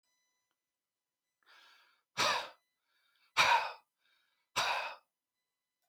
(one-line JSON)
{"exhalation_length": "5.9 s", "exhalation_amplitude": 6881, "exhalation_signal_mean_std_ratio": 0.31, "survey_phase": "beta (2021-08-13 to 2022-03-07)", "age": "45-64", "gender": "Male", "wearing_mask": "No", "symptom_none": true, "smoker_status": "Never smoked", "respiratory_condition_asthma": false, "respiratory_condition_other": false, "recruitment_source": "REACT", "submission_delay": "1 day", "covid_test_result": "Negative", "covid_test_method": "RT-qPCR", "influenza_a_test_result": "Negative", "influenza_b_test_result": "Negative"}